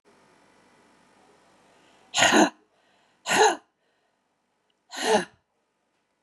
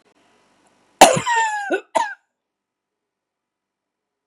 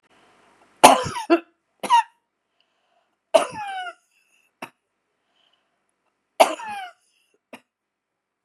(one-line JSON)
{"exhalation_length": "6.2 s", "exhalation_amplitude": 19905, "exhalation_signal_mean_std_ratio": 0.3, "cough_length": "4.3 s", "cough_amplitude": 32768, "cough_signal_mean_std_ratio": 0.29, "three_cough_length": "8.4 s", "three_cough_amplitude": 32768, "three_cough_signal_mean_std_ratio": 0.24, "survey_phase": "beta (2021-08-13 to 2022-03-07)", "age": "65+", "gender": "Female", "wearing_mask": "No", "symptom_runny_or_blocked_nose": true, "symptom_onset": "12 days", "smoker_status": "Ex-smoker", "respiratory_condition_asthma": false, "respiratory_condition_other": false, "recruitment_source": "REACT", "submission_delay": "1 day", "covid_test_result": "Negative", "covid_test_method": "RT-qPCR", "influenza_a_test_result": "Negative", "influenza_b_test_result": "Negative"}